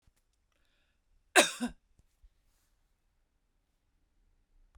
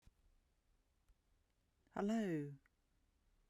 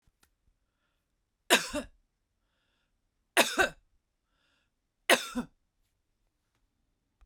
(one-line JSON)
{"cough_length": "4.8 s", "cough_amplitude": 12704, "cough_signal_mean_std_ratio": 0.16, "exhalation_length": "3.5 s", "exhalation_amplitude": 1161, "exhalation_signal_mean_std_ratio": 0.36, "three_cough_length": "7.3 s", "three_cough_amplitude": 15848, "three_cough_signal_mean_std_ratio": 0.22, "survey_phase": "beta (2021-08-13 to 2022-03-07)", "age": "45-64", "gender": "Female", "wearing_mask": "No", "symptom_none": true, "smoker_status": "Ex-smoker", "respiratory_condition_asthma": false, "respiratory_condition_other": false, "recruitment_source": "Test and Trace", "submission_delay": "0 days", "covid_test_result": "Negative", "covid_test_method": "LFT"}